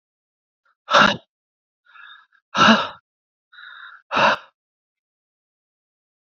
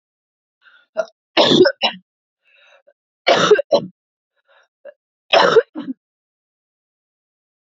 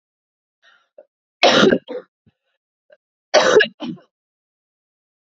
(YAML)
exhalation_length: 6.4 s
exhalation_amplitude: 29668
exhalation_signal_mean_std_ratio: 0.28
three_cough_length: 7.7 s
three_cough_amplitude: 29864
three_cough_signal_mean_std_ratio: 0.32
cough_length: 5.4 s
cough_amplitude: 32768
cough_signal_mean_std_ratio: 0.3
survey_phase: alpha (2021-03-01 to 2021-08-12)
age: 18-44
gender: Female
wearing_mask: 'No'
symptom_cough_any: true
symptom_new_continuous_cough: true
symptom_shortness_of_breath: true
symptom_fatigue: true
symptom_change_to_sense_of_smell_or_taste: true
symptom_loss_of_taste: true
symptom_onset: 10 days
smoker_status: Never smoked
respiratory_condition_asthma: true
respiratory_condition_other: false
recruitment_source: Test and Trace
submission_delay: 2 days
covid_test_result: Positive
covid_test_method: RT-qPCR
covid_ct_value: 22.5
covid_ct_gene: ORF1ab gene
covid_ct_mean: 22.6
covid_viral_load: 38000 copies/ml
covid_viral_load_category: Low viral load (10K-1M copies/ml)